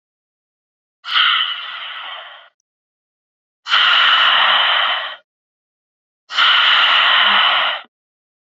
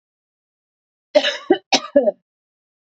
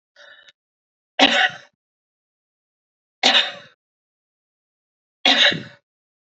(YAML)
exhalation_length: 8.4 s
exhalation_amplitude: 29922
exhalation_signal_mean_std_ratio: 0.58
cough_length: 2.8 s
cough_amplitude: 27711
cough_signal_mean_std_ratio: 0.31
three_cough_length: 6.3 s
three_cough_amplitude: 28819
three_cough_signal_mean_std_ratio: 0.3
survey_phase: beta (2021-08-13 to 2022-03-07)
age: 18-44
gender: Female
wearing_mask: 'No'
symptom_sore_throat: true
smoker_status: Current smoker (e-cigarettes or vapes only)
respiratory_condition_asthma: true
respiratory_condition_other: false
recruitment_source: REACT
submission_delay: 2 days
covid_test_result: Negative
covid_test_method: RT-qPCR
influenza_a_test_result: Negative
influenza_b_test_result: Negative